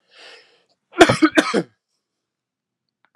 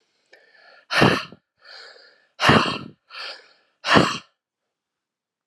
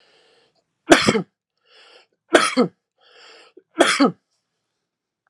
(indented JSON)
{
  "cough_length": "3.2 s",
  "cough_amplitude": 32768,
  "cough_signal_mean_std_ratio": 0.27,
  "exhalation_length": "5.5 s",
  "exhalation_amplitude": 32768,
  "exhalation_signal_mean_std_ratio": 0.34,
  "three_cough_length": "5.3 s",
  "three_cough_amplitude": 32768,
  "three_cough_signal_mean_std_ratio": 0.3,
  "survey_phase": "alpha (2021-03-01 to 2021-08-12)",
  "age": "45-64",
  "gender": "Male",
  "wearing_mask": "No",
  "symptom_none": true,
  "smoker_status": "Ex-smoker",
  "respiratory_condition_asthma": false,
  "respiratory_condition_other": false,
  "recruitment_source": "REACT",
  "submission_delay": "2 days",
  "covid_test_result": "Negative",
  "covid_test_method": "RT-qPCR"
}